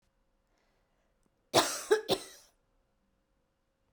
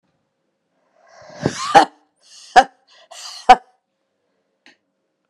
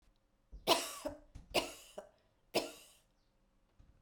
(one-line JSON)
{"cough_length": "3.9 s", "cough_amplitude": 11441, "cough_signal_mean_std_ratio": 0.25, "exhalation_length": "5.3 s", "exhalation_amplitude": 32768, "exhalation_signal_mean_std_ratio": 0.21, "three_cough_length": "4.0 s", "three_cough_amplitude": 5754, "three_cough_signal_mean_std_ratio": 0.32, "survey_phase": "beta (2021-08-13 to 2022-03-07)", "age": "18-44", "gender": "Female", "wearing_mask": "No", "symptom_cough_any": true, "symptom_runny_or_blocked_nose": true, "symptom_fatigue": true, "symptom_headache": true, "symptom_other": true, "symptom_onset": "3 days", "smoker_status": "Never smoked", "respiratory_condition_asthma": false, "respiratory_condition_other": false, "recruitment_source": "Test and Trace", "submission_delay": "2 days", "covid_test_result": "Positive", "covid_test_method": "RT-qPCR", "covid_ct_value": 19.9, "covid_ct_gene": "ORF1ab gene", "covid_ct_mean": 21.3, "covid_viral_load": "100000 copies/ml", "covid_viral_load_category": "Low viral load (10K-1M copies/ml)"}